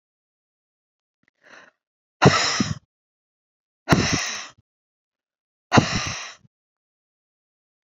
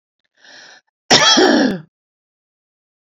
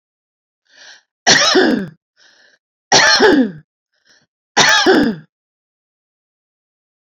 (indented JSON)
{
  "exhalation_length": "7.9 s",
  "exhalation_amplitude": 28516,
  "exhalation_signal_mean_std_ratio": 0.29,
  "cough_length": "3.2 s",
  "cough_amplitude": 32767,
  "cough_signal_mean_std_ratio": 0.39,
  "three_cough_length": "7.2 s",
  "three_cough_amplitude": 32767,
  "three_cough_signal_mean_std_ratio": 0.42,
  "survey_phase": "beta (2021-08-13 to 2022-03-07)",
  "age": "45-64",
  "gender": "Female",
  "wearing_mask": "No",
  "symptom_none": true,
  "smoker_status": "Ex-smoker",
  "respiratory_condition_asthma": true,
  "respiratory_condition_other": false,
  "recruitment_source": "REACT",
  "submission_delay": "1 day",
  "covid_test_result": "Negative",
  "covid_test_method": "RT-qPCR"
}